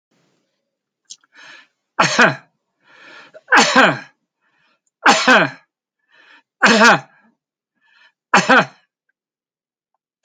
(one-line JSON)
{"cough_length": "10.2 s", "cough_amplitude": 31029, "cough_signal_mean_std_ratio": 0.34, "survey_phase": "alpha (2021-03-01 to 2021-08-12)", "age": "65+", "gender": "Male", "wearing_mask": "No", "symptom_none": true, "smoker_status": "Ex-smoker", "respiratory_condition_asthma": false, "respiratory_condition_other": true, "recruitment_source": "REACT", "submission_delay": "4 days", "covid_test_result": "Negative", "covid_test_method": "RT-qPCR"}